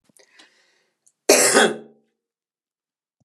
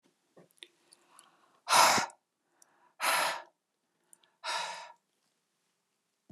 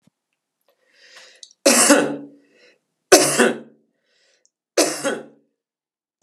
{
  "cough_length": "3.2 s",
  "cough_amplitude": 32275,
  "cough_signal_mean_std_ratio": 0.29,
  "exhalation_length": "6.3 s",
  "exhalation_amplitude": 11331,
  "exhalation_signal_mean_std_ratio": 0.3,
  "three_cough_length": "6.2 s",
  "three_cough_amplitude": 32768,
  "three_cough_signal_mean_std_ratio": 0.34,
  "survey_phase": "alpha (2021-03-01 to 2021-08-12)",
  "age": "45-64",
  "gender": "Female",
  "wearing_mask": "No",
  "symptom_cough_any": true,
  "symptom_abdominal_pain": true,
  "smoker_status": "Current smoker (11 or more cigarettes per day)",
  "respiratory_condition_asthma": false,
  "respiratory_condition_other": false,
  "recruitment_source": "REACT",
  "submission_delay": "1 day",
  "covid_test_result": "Negative",
  "covid_test_method": "RT-qPCR"
}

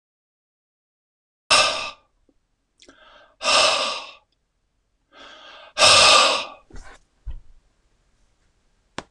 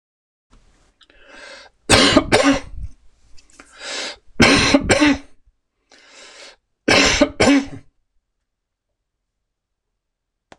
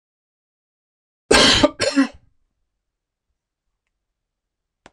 {
  "exhalation_length": "9.1 s",
  "exhalation_amplitude": 25804,
  "exhalation_signal_mean_std_ratio": 0.33,
  "three_cough_length": "10.6 s",
  "three_cough_amplitude": 26028,
  "three_cough_signal_mean_std_ratio": 0.39,
  "cough_length": "4.9 s",
  "cough_amplitude": 26028,
  "cough_signal_mean_std_ratio": 0.27,
  "survey_phase": "beta (2021-08-13 to 2022-03-07)",
  "age": "65+",
  "gender": "Male",
  "wearing_mask": "No",
  "symptom_none": true,
  "smoker_status": "Ex-smoker",
  "respiratory_condition_asthma": false,
  "respiratory_condition_other": false,
  "recruitment_source": "REACT",
  "submission_delay": "2 days",
  "covid_test_result": "Negative",
  "covid_test_method": "RT-qPCR",
  "influenza_a_test_result": "Negative",
  "influenza_b_test_result": "Negative"
}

